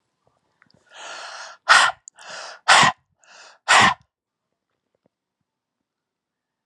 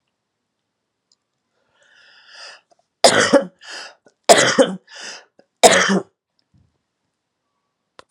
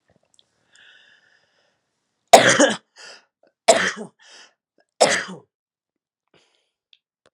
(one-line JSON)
{"exhalation_length": "6.7 s", "exhalation_amplitude": 30832, "exhalation_signal_mean_std_ratio": 0.28, "three_cough_length": "8.1 s", "three_cough_amplitude": 32768, "three_cough_signal_mean_std_ratio": 0.29, "cough_length": "7.3 s", "cough_amplitude": 32768, "cough_signal_mean_std_ratio": 0.24, "survey_phase": "beta (2021-08-13 to 2022-03-07)", "age": "45-64", "gender": "Female", "wearing_mask": "No", "symptom_cough_any": true, "symptom_runny_or_blocked_nose": true, "symptom_sore_throat": true, "symptom_fatigue": true, "symptom_change_to_sense_of_smell_or_taste": true, "symptom_loss_of_taste": true, "smoker_status": "Current smoker (1 to 10 cigarettes per day)", "respiratory_condition_asthma": false, "respiratory_condition_other": false, "recruitment_source": "Test and Trace", "submission_delay": "2 days", "covid_test_result": "Positive", "covid_test_method": "RT-qPCR", "covid_ct_value": 17.3, "covid_ct_gene": "ORF1ab gene", "covid_ct_mean": 17.8, "covid_viral_load": "1400000 copies/ml", "covid_viral_load_category": "High viral load (>1M copies/ml)"}